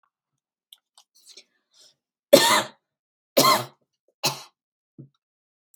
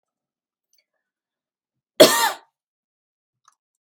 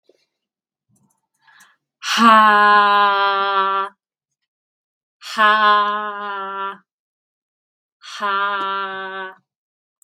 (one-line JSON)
{"three_cough_length": "5.8 s", "three_cough_amplitude": 32768, "three_cough_signal_mean_std_ratio": 0.25, "cough_length": "3.9 s", "cough_amplitude": 32768, "cough_signal_mean_std_ratio": 0.19, "exhalation_length": "10.0 s", "exhalation_amplitude": 32768, "exhalation_signal_mean_std_ratio": 0.49, "survey_phase": "beta (2021-08-13 to 2022-03-07)", "age": "18-44", "gender": "Female", "wearing_mask": "No", "symptom_none": true, "smoker_status": "Current smoker (1 to 10 cigarettes per day)", "respiratory_condition_asthma": false, "respiratory_condition_other": false, "recruitment_source": "REACT", "submission_delay": "0 days", "covid_test_result": "Negative", "covid_test_method": "RT-qPCR"}